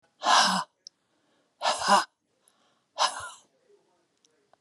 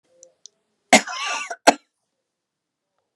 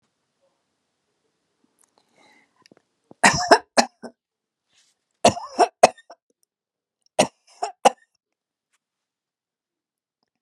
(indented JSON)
{
  "exhalation_length": "4.6 s",
  "exhalation_amplitude": 13964,
  "exhalation_signal_mean_std_ratio": 0.35,
  "cough_length": "3.2 s",
  "cough_amplitude": 32768,
  "cough_signal_mean_std_ratio": 0.22,
  "three_cough_length": "10.4 s",
  "three_cough_amplitude": 32768,
  "three_cough_signal_mean_std_ratio": 0.19,
  "survey_phase": "beta (2021-08-13 to 2022-03-07)",
  "age": "65+",
  "gender": "Female",
  "wearing_mask": "No",
  "symptom_none": true,
  "smoker_status": "Never smoked",
  "respiratory_condition_asthma": false,
  "respiratory_condition_other": false,
  "recruitment_source": "REACT",
  "submission_delay": "2 days",
  "covid_test_result": "Negative",
  "covid_test_method": "RT-qPCR"
}